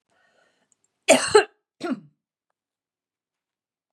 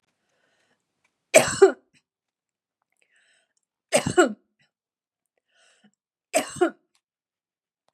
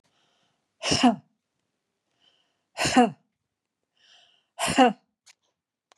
{
  "cough_length": "3.9 s",
  "cough_amplitude": 27366,
  "cough_signal_mean_std_ratio": 0.22,
  "three_cough_length": "7.9 s",
  "three_cough_amplitude": 31992,
  "three_cough_signal_mean_std_ratio": 0.22,
  "exhalation_length": "6.0 s",
  "exhalation_amplitude": 17658,
  "exhalation_signal_mean_std_ratio": 0.29,
  "survey_phase": "beta (2021-08-13 to 2022-03-07)",
  "age": "45-64",
  "gender": "Female",
  "wearing_mask": "No",
  "symptom_change_to_sense_of_smell_or_taste": true,
  "smoker_status": "Never smoked",
  "respiratory_condition_asthma": false,
  "respiratory_condition_other": false,
  "recruitment_source": "REACT",
  "submission_delay": "2 days",
  "covid_test_result": "Negative",
  "covid_test_method": "RT-qPCR",
  "influenza_a_test_result": "Positive",
  "influenza_a_ct_value": 32.9,
  "influenza_b_test_result": "Positive",
  "influenza_b_ct_value": 33.4
}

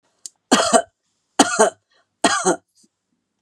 {
  "three_cough_length": "3.4 s",
  "three_cough_amplitude": 32767,
  "three_cough_signal_mean_std_ratio": 0.38,
  "survey_phase": "beta (2021-08-13 to 2022-03-07)",
  "age": "65+",
  "gender": "Female",
  "wearing_mask": "No",
  "symptom_cough_any": true,
  "symptom_runny_or_blocked_nose": true,
  "symptom_sore_throat": true,
  "symptom_headache": true,
  "smoker_status": "Never smoked",
  "respiratory_condition_asthma": false,
  "respiratory_condition_other": false,
  "recruitment_source": "Test and Trace",
  "submission_delay": "1 day",
  "covid_test_result": "Negative",
  "covid_test_method": "RT-qPCR"
}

